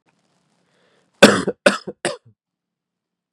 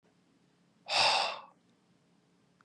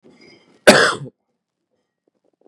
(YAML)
three_cough_length: 3.3 s
three_cough_amplitude: 32768
three_cough_signal_mean_std_ratio: 0.23
exhalation_length: 2.6 s
exhalation_amplitude: 7074
exhalation_signal_mean_std_ratio: 0.35
cough_length: 2.5 s
cough_amplitude: 32768
cough_signal_mean_std_ratio: 0.26
survey_phase: beta (2021-08-13 to 2022-03-07)
age: 18-44
gender: Male
wearing_mask: 'No'
symptom_cough_any: true
symptom_runny_or_blocked_nose: true
symptom_sore_throat: true
symptom_fatigue: true
symptom_fever_high_temperature: true
symptom_headache: true
symptom_onset: 2 days
smoker_status: Never smoked
respiratory_condition_asthma: false
respiratory_condition_other: false
recruitment_source: Test and Trace
submission_delay: 1 day
covid_test_result: Positive
covid_test_method: RT-qPCR
covid_ct_value: 26.2
covid_ct_gene: N gene